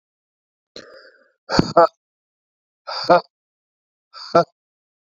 {"exhalation_length": "5.1 s", "exhalation_amplitude": 32768, "exhalation_signal_mean_std_ratio": 0.25, "survey_phase": "beta (2021-08-13 to 2022-03-07)", "age": "45-64", "gender": "Male", "wearing_mask": "No", "symptom_cough_any": true, "symptom_shortness_of_breath": true, "symptom_sore_throat": true, "symptom_fatigue": true, "symptom_fever_high_temperature": true, "symptom_change_to_sense_of_smell_or_taste": true, "symptom_onset": "6 days", "smoker_status": "Ex-smoker", "respiratory_condition_asthma": false, "respiratory_condition_other": false, "recruitment_source": "Test and Trace", "submission_delay": "2 days", "covid_test_result": "Positive", "covid_test_method": "RT-qPCR", "covid_ct_value": 20.7, "covid_ct_gene": "ORF1ab gene", "covid_ct_mean": 21.2, "covid_viral_load": "110000 copies/ml", "covid_viral_load_category": "Low viral load (10K-1M copies/ml)"}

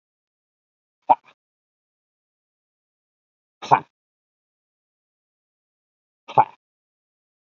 {"exhalation_length": "7.4 s", "exhalation_amplitude": 27415, "exhalation_signal_mean_std_ratio": 0.12, "survey_phase": "beta (2021-08-13 to 2022-03-07)", "age": "45-64", "gender": "Male", "wearing_mask": "No", "symptom_cough_any": true, "symptom_runny_or_blocked_nose": true, "symptom_fatigue": true, "smoker_status": "Never smoked", "respiratory_condition_asthma": false, "respiratory_condition_other": false, "recruitment_source": "Test and Trace", "submission_delay": "2 days", "covid_test_result": "Positive", "covid_test_method": "RT-qPCR", "covid_ct_value": 22.1, "covid_ct_gene": "ORF1ab gene"}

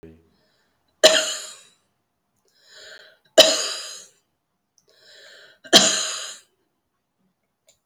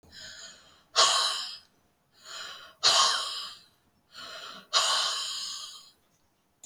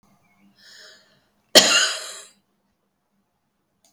{"three_cough_length": "7.9 s", "three_cough_amplitude": 31722, "three_cough_signal_mean_std_ratio": 0.27, "exhalation_length": "6.7 s", "exhalation_amplitude": 12598, "exhalation_signal_mean_std_ratio": 0.46, "cough_length": "3.9 s", "cough_amplitude": 32767, "cough_signal_mean_std_ratio": 0.24, "survey_phase": "alpha (2021-03-01 to 2021-08-12)", "age": "65+", "gender": "Female", "wearing_mask": "No", "symptom_none": true, "smoker_status": "Ex-smoker", "respiratory_condition_asthma": false, "respiratory_condition_other": false, "recruitment_source": "REACT", "submission_delay": "2 days", "covid_test_result": "Negative", "covid_test_method": "RT-qPCR"}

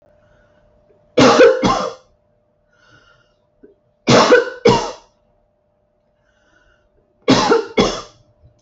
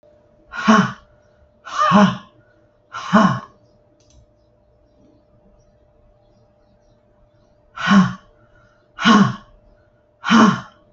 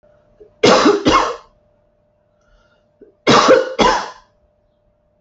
{"three_cough_length": "8.6 s", "three_cough_amplitude": 29528, "three_cough_signal_mean_std_ratio": 0.38, "exhalation_length": "10.9 s", "exhalation_amplitude": 32768, "exhalation_signal_mean_std_ratio": 0.35, "cough_length": "5.2 s", "cough_amplitude": 31257, "cough_signal_mean_std_ratio": 0.42, "survey_phase": "alpha (2021-03-01 to 2021-08-12)", "age": "45-64", "gender": "Female", "wearing_mask": "No", "symptom_none": true, "smoker_status": "Ex-smoker", "respiratory_condition_asthma": true, "respiratory_condition_other": false, "recruitment_source": "REACT", "submission_delay": "1 day", "covid_test_result": "Negative", "covid_test_method": "RT-qPCR"}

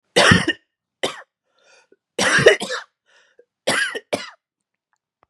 {"three_cough_length": "5.3 s", "three_cough_amplitude": 32768, "three_cough_signal_mean_std_ratio": 0.36, "survey_phase": "beta (2021-08-13 to 2022-03-07)", "age": "18-44", "gender": "Male", "wearing_mask": "No", "symptom_cough_any": true, "symptom_onset": "12 days", "smoker_status": "Never smoked", "respiratory_condition_asthma": false, "respiratory_condition_other": false, "recruitment_source": "REACT", "submission_delay": "1 day", "covid_test_result": "Negative", "covid_test_method": "RT-qPCR", "influenza_a_test_result": "Negative", "influenza_b_test_result": "Negative"}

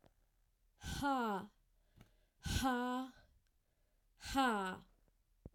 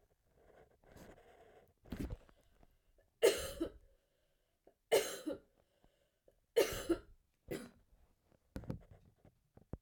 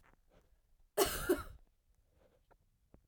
{"exhalation_length": "5.5 s", "exhalation_amplitude": 2470, "exhalation_signal_mean_std_ratio": 0.48, "three_cough_length": "9.8 s", "three_cough_amplitude": 4238, "three_cough_signal_mean_std_ratio": 0.28, "cough_length": "3.1 s", "cough_amplitude": 4693, "cough_signal_mean_std_ratio": 0.29, "survey_phase": "alpha (2021-03-01 to 2021-08-12)", "age": "18-44", "gender": "Male", "wearing_mask": "No", "symptom_cough_any": true, "symptom_new_continuous_cough": true, "symptom_fatigue": true, "symptom_fever_high_temperature": true, "symptom_headache": true, "smoker_status": "Never smoked", "respiratory_condition_asthma": true, "respiratory_condition_other": false, "recruitment_source": "Test and Trace", "submission_delay": "2 days", "covid_test_result": "Positive", "covid_test_method": "RT-qPCR", "covid_ct_value": 21.5, "covid_ct_gene": "ORF1ab gene"}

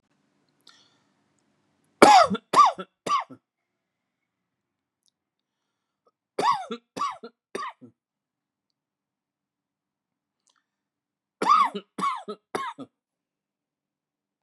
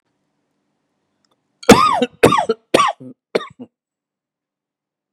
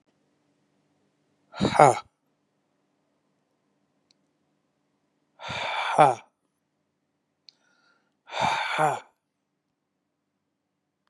{"three_cough_length": "14.4 s", "three_cough_amplitude": 32595, "three_cough_signal_mean_std_ratio": 0.25, "cough_length": "5.1 s", "cough_amplitude": 32768, "cough_signal_mean_std_ratio": 0.3, "exhalation_length": "11.1 s", "exhalation_amplitude": 30055, "exhalation_signal_mean_std_ratio": 0.24, "survey_phase": "beta (2021-08-13 to 2022-03-07)", "age": "18-44", "gender": "Male", "wearing_mask": "No", "symptom_abdominal_pain": true, "symptom_fatigue": true, "symptom_onset": "11 days", "smoker_status": "Ex-smoker", "respiratory_condition_asthma": false, "respiratory_condition_other": true, "recruitment_source": "REACT", "submission_delay": "5 days", "covid_test_result": "Negative", "covid_test_method": "RT-qPCR"}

